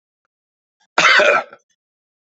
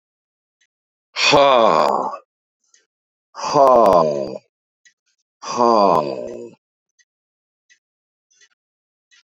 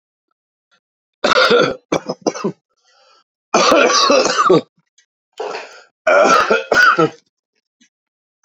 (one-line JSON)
{"cough_length": "2.4 s", "cough_amplitude": 30358, "cough_signal_mean_std_ratio": 0.35, "exhalation_length": "9.4 s", "exhalation_amplitude": 31694, "exhalation_signal_mean_std_ratio": 0.39, "three_cough_length": "8.4 s", "three_cough_amplitude": 32768, "three_cough_signal_mean_std_ratio": 0.49, "survey_phase": "beta (2021-08-13 to 2022-03-07)", "age": "65+", "gender": "Male", "wearing_mask": "No", "symptom_cough_any": true, "symptom_runny_or_blocked_nose": true, "symptom_shortness_of_breath": true, "symptom_sore_throat": true, "symptom_fatigue": true, "symptom_other": true, "smoker_status": "Current smoker (1 to 10 cigarettes per day)", "respiratory_condition_asthma": false, "respiratory_condition_other": false, "recruitment_source": "Test and Trace", "submission_delay": "1 day", "covid_test_result": "Positive", "covid_test_method": "ePCR"}